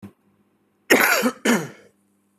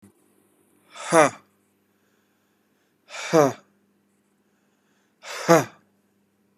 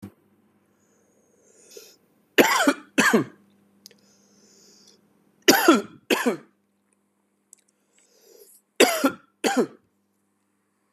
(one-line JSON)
{"cough_length": "2.4 s", "cough_amplitude": 29447, "cough_signal_mean_std_ratio": 0.41, "exhalation_length": "6.6 s", "exhalation_amplitude": 30611, "exhalation_signal_mean_std_ratio": 0.24, "three_cough_length": "10.9 s", "three_cough_amplitude": 27525, "three_cough_signal_mean_std_ratio": 0.3, "survey_phase": "beta (2021-08-13 to 2022-03-07)", "age": "18-44", "gender": "Male", "wearing_mask": "No", "symptom_cough_any": true, "symptom_runny_or_blocked_nose": true, "symptom_fatigue": true, "symptom_onset": "2 days", "smoker_status": "Never smoked", "respiratory_condition_asthma": true, "respiratory_condition_other": false, "recruitment_source": "REACT", "submission_delay": "1 day", "covid_test_result": "Negative", "covid_test_method": "RT-qPCR", "influenza_a_test_result": "Negative", "influenza_b_test_result": "Negative"}